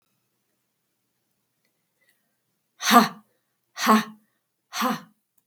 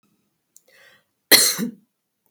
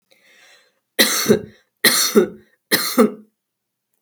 {"exhalation_length": "5.5 s", "exhalation_amplitude": 32766, "exhalation_signal_mean_std_ratio": 0.25, "cough_length": "2.3 s", "cough_amplitude": 32768, "cough_signal_mean_std_ratio": 0.27, "three_cough_length": "4.0 s", "three_cough_amplitude": 32768, "three_cough_signal_mean_std_ratio": 0.41, "survey_phase": "beta (2021-08-13 to 2022-03-07)", "age": "45-64", "gender": "Female", "wearing_mask": "No", "symptom_none": true, "symptom_onset": "5 days", "smoker_status": "Never smoked", "respiratory_condition_asthma": false, "respiratory_condition_other": false, "recruitment_source": "REACT", "submission_delay": "1 day", "covid_test_result": "Negative", "covid_test_method": "RT-qPCR", "influenza_a_test_result": "Negative", "influenza_b_test_result": "Negative"}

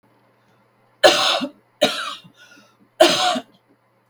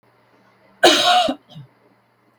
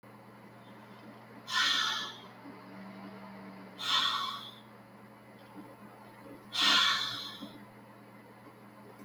{"three_cough_length": "4.1 s", "three_cough_amplitude": 32768, "three_cough_signal_mean_std_ratio": 0.38, "cough_length": "2.4 s", "cough_amplitude": 32768, "cough_signal_mean_std_ratio": 0.39, "exhalation_length": "9.0 s", "exhalation_amplitude": 6966, "exhalation_signal_mean_std_ratio": 0.5, "survey_phase": "beta (2021-08-13 to 2022-03-07)", "age": "65+", "gender": "Female", "wearing_mask": "No", "symptom_none": true, "smoker_status": "Never smoked", "respiratory_condition_asthma": false, "respiratory_condition_other": false, "recruitment_source": "REACT", "submission_delay": "2 days", "covid_test_result": "Negative", "covid_test_method": "RT-qPCR", "influenza_a_test_result": "Negative", "influenza_b_test_result": "Negative"}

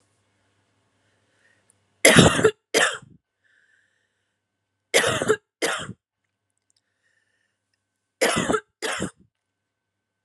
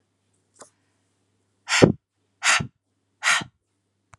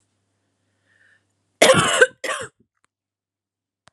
{"three_cough_length": "10.2 s", "three_cough_amplitude": 32768, "three_cough_signal_mean_std_ratio": 0.3, "exhalation_length": "4.2 s", "exhalation_amplitude": 32768, "exhalation_signal_mean_std_ratio": 0.27, "cough_length": "3.9 s", "cough_amplitude": 32768, "cough_signal_mean_std_ratio": 0.28, "survey_phase": "beta (2021-08-13 to 2022-03-07)", "age": "45-64", "gender": "Female", "wearing_mask": "No", "symptom_cough_any": true, "symptom_runny_or_blocked_nose": true, "symptom_fatigue": true, "symptom_headache": true, "symptom_change_to_sense_of_smell_or_taste": true, "symptom_loss_of_taste": true, "smoker_status": "Never smoked", "respiratory_condition_asthma": false, "respiratory_condition_other": false, "recruitment_source": "Test and Trace", "submission_delay": "2 days", "covid_test_result": "Positive", "covid_test_method": "RT-qPCR", "covid_ct_value": 25.6, "covid_ct_gene": "ORF1ab gene"}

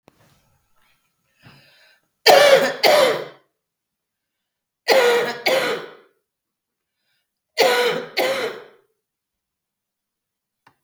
{"three_cough_length": "10.8 s", "three_cough_amplitude": 32768, "three_cough_signal_mean_std_ratio": 0.37, "survey_phase": "beta (2021-08-13 to 2022-03-07)", "age": "45-64", "gender": "Female", "wearing_mask": "No", "symptom_cough_any": true, "symptom_runny_or_blocked_nose": true, "symptom_onset": "3 days", "smoker_status": "Current smoker (1 to 10 cigarettes per day)", "respiratory_condition_asthma": false, "respiratory_condition_other": false, "recruitment_source": "REACT", "submission_delay": "13 days", "covid_test_result": "Negative", "covid_test_method": "RT-qPCR"}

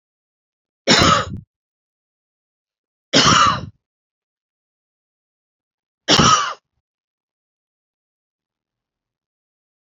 {"three_cough_length": "9.8 s", "three_cough_amplitude": 32549, "three_cough_signal_mean_std_ratio": 0.29, "survey_phase": "beta (2021-08-13 to 2022-03-07)", "age": "45-64", "gender": "Female", "wearing_mask": "No", "symptom_none": true, "symptom_onset": "4 days", "smoker_status": "Never smoked", "respiratory_condition_asthma": false, "respiratory_condition_other": false, "recruitment_source": "REACT", "submission_delay": "0 days", "covid_test_result": "Negative", "covid_test_method": "RT-qPCR", "influenza_a_test_result": "Negative", "influenza_b_test_result": "Negative"}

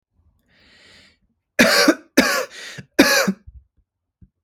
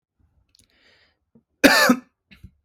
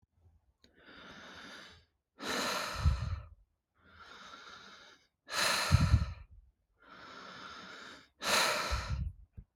{"three_cough_length": "4.4 s", "three_cough_amplitude": 32768, "three_cough_signal_mean_std_ratio": 0.37, "cough_length": "2.6 s", "cough_amplitude": 32768, "cough_signal_mean_std_ratio": 0.28, "exhalation_length": "9.6 s", "exhalation_amplitude": 7562, "exhalation_signal_mean_std_ratio": 0.45, "survey_phase": "beta (2021-08-13 to 2022-03-07)", "age": "18-44", "gender": "Male", "wearing_mask": "No", "symptom_none": true, "smoker_status": "Never smoked", "respiratory_condition_asthma": false, "respiratory_condition_other": false, "recruitment_source": "REACT", "submission_delay": "2 days", "covid_test_result": "Negative", "covid_test_method": "RT-qPCR", "influenza_a_test_result": "Negative", "influenza_b_test_result": "Negative"}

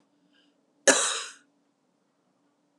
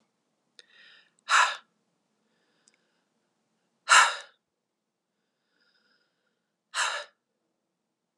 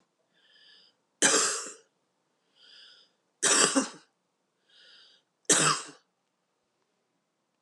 {"cough_length": "2.8 s", "cough_amplitude": 24331, "cough_signal_mean_std_ratio": 0.25, "exhalation_length": "8.2 s", "exhalation_amplitude": 17643, "exhalation_signal_mean_std_ratio": 0.21, "three_cough_length": "7.6 s", "three_cough_amplitude": 17192, "three_cough_signal_mean_std_ratio": 0.31, "survey_phase": "beta (2021-08-13 to 2022-03-07)", "age": "45-64", "gender": "Female", "wearing_mask": "No", "symptom_runny_or_blocked_nose": true, "symptom_onset": "2 days", "smoker_status": "Never smoked", "respiratory_condition_asthma": false, "respiratory_condition_other": false, "recruitment_source": "Test and Trace", "submission_delay": "1 day", "covid_test_result": "Positive", "covid_test_method": "RT-qPCR", "covid_ct_value": 16.9, "covid_ct_gene": "ORF1ab gene", "covid_ct_mean": 18.1, "covid_viral_load": "1200000 copies/ml", "covid_viral_load_category": "High viral load (>1M copies/ml)"}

